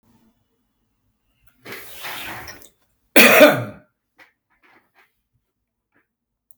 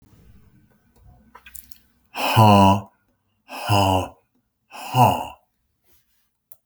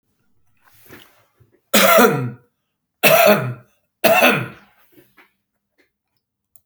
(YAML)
cough_length: 6.6 s
cough_amplitude: 32768
cough_signal_mean_std_ratio: 0.24
exhalation_length: 6.7 s
exhalation_amplitude: 28697
exhalation_signal_mean_std_ratio: 0.36
three_cough_length: 6.7 s
three_cough_amplitude: 32768
three_cough_signal_mean_std_ratio: 0.38
survey_phase: beta (2021-08-13 to 2022-03-07)
age: 65+
gender: Male
wearing_mask: 'No'
symptom_none: true
smoker_status: Ex-smoker
respiratory_condition_asthma: false
respiratory_condition_other: false
recruitment_source: REACT
submission_delay: 3 days
covid_test_result: Negative
covid_test_method: RT-qPCR